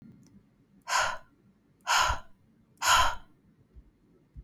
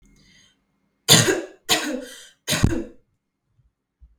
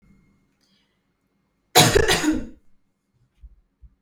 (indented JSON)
{
  "exhalation_length": "4.4 s",
  "exhalation_amplitude": 10201,
  "exhalation_signal_mean_std_ratio": 0.39,
  "three_cough_length": "4.2 s",
  "three_cough_amplitude": 32767,
  "three_cough_signal_mean_std_ratio": 0.35,
  "cough_length": "4.0 s",
  "cough_amplitude": 32768,
  "cough_signal_mean_std_ratio": 0.32,
  "survey_phase": "beta (2021-08-13 to 2022-03-07)",
  "age": "18-44",
  "gender": "Female",
  "wearing_mask": "No",
  "symptom_fatigue": true,
  "symptom_headache": true,
  "symptom_onset": "7 days",
  "smoker_status": "Never smoked",
  "respiratory_condition_asthma": false,
  "respiratory_condition_other": false,
  "recruitment_source": "Test and Trace",
  "submission_delay": "2 days",
  "covid_test_result": "Positive",
  "covid_test_method": "RT-qPCR",
  "covid_ct_value": 15.0,
  "covid_ct_gene": "N gene"
}